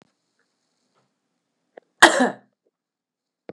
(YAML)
cough_length: 3.5 s
cough_amplitude: 32768
cough_signal_mean_std_ratio: 0.18
survey_phase: beta (2021-08-13 to 2022-03-07)
age: 18-44
gender: Female
wearing_mask: 'No'
symptom_cough_any: true
symptom_runny_or_blocked_nose: true
symptom_fatigue: true
symptom_headache: true
symptom_change_to_sense_of_smell_or_taste: true
symptom_loss_of_taste: true
symptom_onset: 3 days
smoker_status: Never smoked
respiratory_condition_asthma: false
respiratory_condition_other: false
recruitment_source: Test and Trace
submission_delay: 1 day
covid_test_result: Positive
covid_test_method: RT-qPCR
covid_ct_value: 20.0
covid_ct_gene: ORF1ab gene
covid_ct_mean: 20.9
covid_viral_load: 140000 copies/ml
covid_viral_load_category: Low viral load (10K-1M copies/ml)